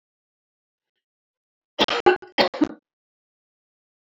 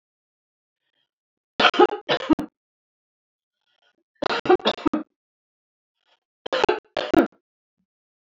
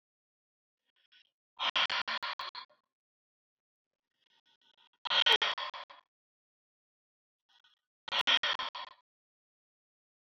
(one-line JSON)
{"cough_length": "4.1 s", "cough_amplitude": 26633, "cough_signal_mean_std_ratio": 0.24, "three_cough_length": "8.4 s", "three_cough_amplitude": 32768, "three_cough_signal_mean_std_ratio": 0.28, "exhalation_length": "10.3 s", "exhalation_amplitude": 7244, "exhalation_signal_mean_std_ratio": 0.29, "survey_phase": "alpha (2021-03-01 to 2021-08-12)", "age": "65+", "gender": "Female", "wearing_mask": "No", "symptom_none": true, "smoker_status": "Never smoked", "respiratory_condition_asthma": false, "respiratory_condition_other": false, "recruitment_source": "REACT", "submission_delay": "2 days", "covid_test_result": "Negative", "covid_test_method": "RT-qPCR"}